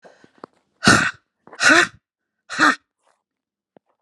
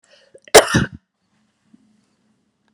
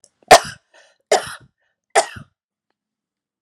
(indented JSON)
{
  "exhalation_length": "4.0 s",
  "exhalation_amplitude": 32768,
  "exhalation_signal_mean_std_ratio": 0.33,
  "cough_length": "2.7 s",
  "cough_amplitude": 32768,
  "cough_signal_mean_std_ratio": 0.21,
  "three_cough_length": "3.4 s",
  "three_cough_amplitude": 32768,
  "three_cough_signal_mean_std_ratio": 0.22,
  "survey_phase": "beta (2021-08-13 to 2022-03-07)",
  "age": "18-44",
  "gender": "Female",
  "wearing_mask": "No",
  "symptom_runny_or_blocked_nose": true,
  "symptom_fatigue": true,
  "symptom_onset": "12 days",
  "smoker_status": "Ex-smoker",
  "respiratory_condition_asthma": false,
  "respiratory_condition_other": false,
  "recruitment_source": "REACT",
  "submission_delay": "1 day",
  "covid_test_result": "Negative",
  "covid_test_method": "RT-qPCR"
}